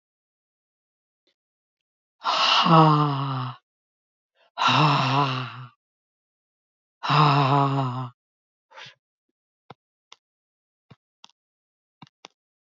{"exhalation_length": "12.7 s", "exhalation_amplitude": 23685, "exhalation_signal_mean_std_ratio": 0.4, "survey_phase": "alpha (2021-03-01 to 2021-08-12)", "age": "65+", "gender": "Female", "wearing_mask": "No", "symptom_cough_any": true, "symptom_onset": "5 days", "smoker_status": "Ex-smoker", "respiratory_condition_asthma": false, "respiratory_condition_other": false, "recruitment_source": "Test and Trace", "submission_delay": "2 days", "covid_test_result": "Positive", "covid_test_method": "RT-qPCR", "covid_ct_value": 27.4, "covid_ct_gene": "ORF1ab gene", "covid_ct_mean": 28.5, "covid_viral_load": "440 copies/ml", "covid_viral_load_category": "Minimal viral load (< 10K copies/ml)"}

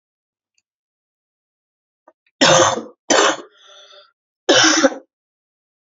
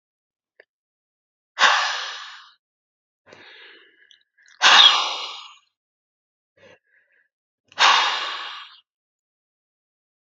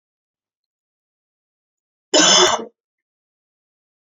{"three_cough_length": "5.8 s", "three_cough_amplitude": 32768, "three_cough_signal_mean_std_ratio": 0.35, "exhalation_length": "10.2 s", "exhalation_amplitude": 31876, "exhalation_signal_mean_std_ratio": 0.3, "cough_length": "4.1 s", "cough_amplitude": 29665, "cough_signal_mean_std_ratio": 0.27, "survey_phase": "beta (2021-08-13 to 2022-03-07)", "age": "18-44", "gender": "Female", "wearing_mask": "No", "symptom_new_continuous_cough": true, "symptom_sore_throat": true, "symptom_fatigue": true, "symptom_headache": true, "smoker_status": "Never smoked", "respiratory_condition_asthma": false, "respiratory_condition_other": false, "recruitment_source": "Test and Trace", "submission_delay": "1 day", "covid_test_result": "Positive", "covid_test_method": "RT-qPCR", "covid_ct_value": 26.7, "covid_ct_gene": "ORF1ab gene", "covid_ct_mean": 27.1, "covid_viral_load": "1300 copies/ml", "covid_viral_load_category": "Minimal viral load (< 10K copies/ml)"}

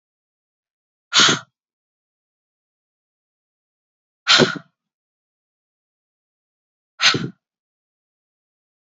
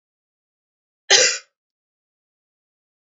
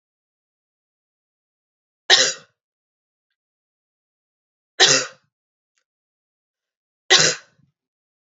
{"exhalation_length": "8.9 s", "exhalation_amplitude": 30409, "exhalation_signal_mean_std_ratio": 0.21, "cough_length": "3.2 s", "cough_amplitude": 29884, "cough_signal_mean_std_ratio": 0.22, "three_cough_length": "8.4 s", "three_cough_amplitude": 30900, "three_cough_signal_mean_std_ratio": 0.22, "survey_phase": "beta (2021-08-13 to 2022-03-07)", "age": "18-44", "gender": "Female", "wearing_mask": "No", "symptom_cough_any": true, "symptom_new_continuous_cough": true, "symptom_runny_or_blocked_nose": true, "symptom_fatigue": true, "symptom_fever_high_temperature": true, "symptom_headache": true, "smoker_status": "Never smoked", "respiratory_condition_asthma": false, "respiratory_condition_other": false, "recruitment_source": "Test and Trace", "submission_delay": "1 day", "covid_test_result": "Positive", "covid_test_method": "RT-qPCR", "covid_ct_value": 14.8, "covid_ct_gene": "ORF1ab gene", "covid_ct_mean": 15.0, "covid_viral_load": "12000000 copies/ml", "covid_viral_load_category": "High viral load (>1M copies/ml)"}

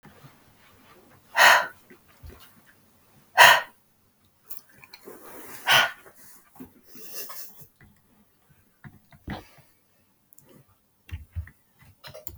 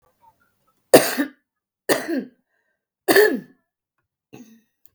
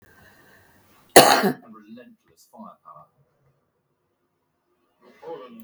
{"exhalation_length": "12.4 s", "exhalation_amplitude": 32766, "exhalation_signal_mean_std_ratio": 0.24, "three_cough_length": "4.9 s", "three_cough_amplitude": 32768, "three_cough_signal_mean_std_ratio": 0.29, "cough_length": "5.6 s", "cough_amplitude": 32768, "cough_signal_mean_std_ratio": 0.21, "survey_phase": "beta (2021-08-13 to 2022-03-07)", "age": "45-64", "gender": "Female", "wearing_mask": "No", "symptom_none": true, "smoker_status": "Ex-smoker", "respiratory_condition_asthma": false, "respiratory_condition_other": true, "recruitment_source": "REACT", "submission_delay": "1 day", "covid_test_result": "Negative", "covid_test_method": "RT-qPCR", "influenza_a_test_result": "Unknown/Void", "influenza_b_test_result": "Unknown/Void"}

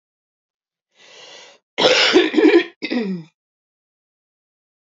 {"cough_length": "4.9 s", "cough_amplitude": 28341, "cough_signal_mean_std_ratio": 0.38, "survey_phase": "alpha (2021-03-01 to 2021-08-12)", "age": "45-64", "gender": "Female", "wearing_mask": "No", "symptom_cough_any": true, "symptom_onset": "4 days", "smoker_status": "Ex-smoker", "respiratory_condition_asthma": true, "respiratory_condition_other": false, "recruitment_source": "Test and Trace", "submission_delay": "1 day", "covid_test_result": "Positive", "covid_test_method": "RT-qPCR", "covid_ct_value": 16.5, "covid_ct_gene": "ORF1ab gene"}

